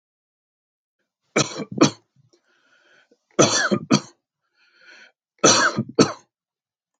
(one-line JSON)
{"three_cough_length": "7.0 s", "three_cough_amplitude": 29515, "three_cough_signal_mean_std_ratio": 0.32, "survey_phase": "beta (2021-08-13 to 2022-03-07)", "age": "45-64", "gender": "Male", "wearing_mask": "No", "symptom_none": true, "smoker_status": "Never smoked", "respiratory_condition_asthma": false, "respiratory_condition_other": false, "recruitment_source": "Test and Trace", "submission_delay": "0 days", "covid_test_result": "Negative", "covid_test_method": "LFT"}